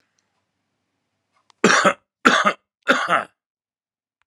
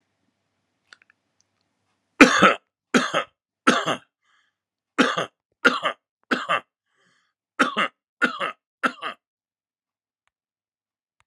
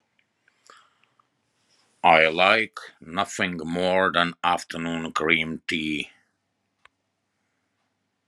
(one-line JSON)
{"cough_length": "4.3 s", "cough_amplitude": 32767, "cough_signal_mean_std_ratio": 0.34, "three_cough_length": "11.3 s", "three_cough_amplitude": 32768, "three_cough_signal_mean_std_ratio": 0.28, "exhalation_length": "8.3 s", "exhalation_amplitude": 27151, "exhalation_signal_mean_std_ratio": 0.4, "survey_phase": "alpha (2021-03-01 to 2021-08-12)", "age": "45-64", "gender": "Male", "wearing_mask": "No", "symptom_none": true, "smoker_status": "Current smoker (1 to 10 cigarettes per day)", "respiratory_condition_asthma": false, "respiratory_condition_other": false, "recruitment_source": "REACT", "submission_delay": "1 day", "covid_test_result": "Negative", "covid_test_method": "RT-qPCR"}